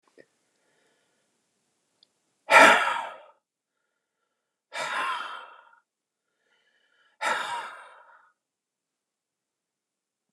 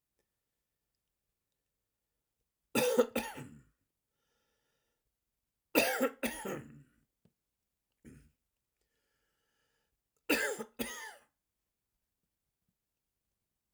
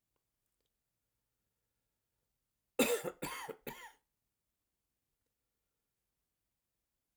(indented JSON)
{
  "exhalation_length": "10.3 s",
  "exhalation_amplitude": 28679,
  "exhalation_signal_mean_std_ratio": 0.23,
  "three_cough_length": "13.7 s",
  "three_cough_amplitude": 8724,
  "three_cough_signal_mean_std_ratio": 0.26,
  "cough_length": "7.2 s",
  "cough_amplitude": 4585,
  "cough_signal_mean_std_ratio": 0.21,
  "survey_phase": "alpha (2021-03-01 to 2021-08-12)",
  "age": "65+",
  "gender": "Male",
  "wearing_mask": "No",
  "symptom_cough_any": true,
  "symptom_onset": "6 days",
  "smoker_status": "Never smoked",
  "respiratory_condition_asthma": true,
  "respiratory_condition_other": false,
  "recruitment_source": "REACT",
  "submission_delay": "1 day",
  "covid_test_result": "Negative",
  "covid_test_method": "RT-qPCR"
}